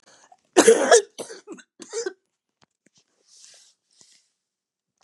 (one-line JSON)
{"cough_length": "5.0 s", "cough_amplitude": 32006, "cough_signal_mean_std_ratio": 0.25, "survey_phase": "beta (2021-08-13 to 2022-03-07)", "age": "65+", "gender": "Female", "wearing_mask": "No", "symptom_cough_any": true, "symptom_runny_or_blocked_nose": true, "symptom_shortness_of_breath": true, "symptom_fatigue": true, "symptom_onset": "7 days", "smoker_status": "Ex-smoker", "respiratory_condition_asthma": true, "respiratory_condition_other": false, "recruitment_source": "REACT", "submission_delay": "1 day", "covid_test_result": "Negative", "covid_test_method": "RT-qPCR", "influenza_a_test_result": "Negative", "influenza_b_test_result": "Negative"}